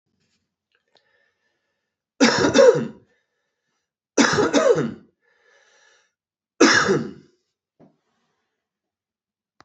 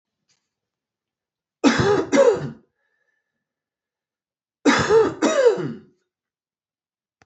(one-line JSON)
{"three_cough_length": "9.6 s", "three_cough_amplitude": 28159, "three_cough_signal_mean_std_ratio": 0.33, "cough_length": "7.3 s", "cough_amplitude": 26341, "cough_signal_mean_std_ratio": 0.39, "survey_phase": "alpha (2021-03-01 to 2021-08-12)", "age": "45-64", "gender": "Male", "wearing_mask": "No", "symptom_loss_of_taste": true, "symptom_onset": "6 days", "smoker_status": "Prefer not to say", "respiratory_condition_asthma": false, "respiratory_condition_other": false, "recruitment_source": "Test and Trace", "submission_delay": "2 days", "covid_test_result": "Positive", "covid_test_method": "RT-qPCR", "covid_ct_value": 16.0, "covid_ct_gene": "N gene", "covid_ct_mean": 17.5, "covid_viral_load": "1900000 copies/ml", "covid_viral_load_category": "High viral load (>1M copies/ml)"}